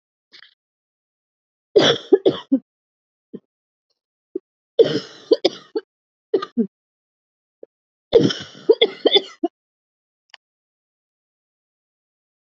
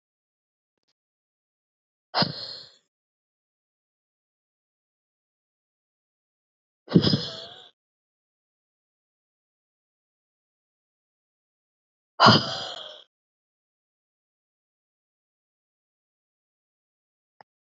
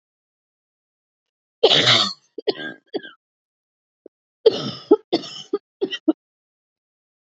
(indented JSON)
{
  "three_cough_length": "12.5 s",
  "three_cough_amplitude": 28550,
  "three_cough_signal_mean_std_ratio": 0.25,
  "exhalation_length": "17.7 s",
  "exhalation_amplitude": 26109,
  "exhalation_signal_mean_std_ratio": 0.16,
  "cough_length": "7.3 s",
  "cough_amplitude": 30446,
  "cough_signal_mean_std_ratio": 0.29,
  "survey_phase": "alpha (2021-03-01 to 2021-08-12)",
  "age": "18-44",
  "gender": "Female",
  "wearing_mask": "No",
  "symptom_cough_any": true,
  "symptom_shortness_of_breath": true,
  "symptom_fatigue": true,
  "symptom_headache": true,
  "symptom_change_to_sense_of_smell_or_taste": true,
  "symptom_loss_of_taste": true,
  "symptom_onset": "4 days",
  "smoker_status": "Never smoked",
  "respiratory_condition_asthma": false,
  "respiratory_condition_other": false,
  "recruitment_source": "Test and Trace",
  "submission_delay": "1 day",
  "covid_test_result": "Positive",
  "covid_test_method": "RT-qPCR"
}